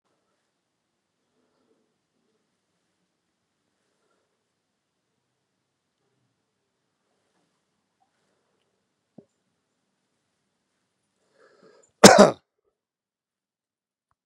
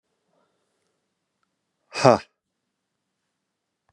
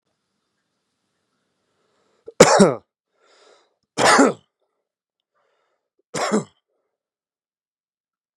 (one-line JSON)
{"cough_length": "14.3 s", "cough_amplitude": 32768, "cough_signal_mean_std_ratio": 0.1, "exhalation_length": "3.9 s", "exhalation_amplitude": 31884, "exhalation_signal_mean_std_ratio": 0.14, "three_cough_length": "8.4 s", "three_cough_amplitude": 32768, "three_cough_signal_mean_std_ratio": 0.24, "survey_phase": "beta (2021-08-13 to 2022-03-07)", "age": "45-64", "gender": "Male", "wearing_mask": "No", "symptom_none": true, "smoker_status": "Current smoker (e-cigarettes or vapes only)", "respiratory_condition_asthma": false, "respiratory_condition_other": false, "recruitment_source": "REACT", "submission_delay": "2 days", "covid_test_result": "Negative", "covid_test_method": "RT-qPCR", "influenza_a_test_result": "Negative", "influenza_b_test_result": "Negative"}